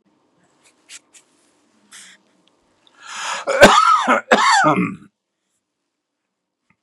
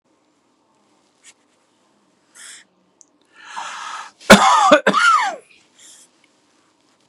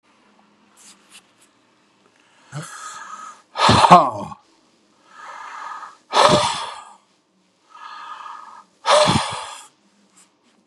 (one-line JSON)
{"cough_length": "6.8 s", "cough_amplitude": 32768, "cough_signal_mean_std_ratio": 0.36, "three_cough_length": "7.1 s", "three_cough_amplitude": 32768, "three_cough_signal_mean_std_ratio": 0.31, "exhalation_length": "10.7 s", "exhalation_amplitude": 32768, "exhalation_signal_mean_std_ratio": 0.33, "survey_phase": "beta (2021-08-13 to 2022-03-07)", "age": "65+", "gender": "Male", "wearing_mask": "No", "symptom_none": true, "smoker_status": "Never smoked", "respiratory_condition_asthma": false, "respiratory_condition_other": false, "recruitment_source": "REACT", "submission_delay": "1 day", "covid_test_result": "Negative", "covid_test_method": "RT-qPCR", "influenza_a_test_result": "Negative", "influenza_b_test_result": "Negative"}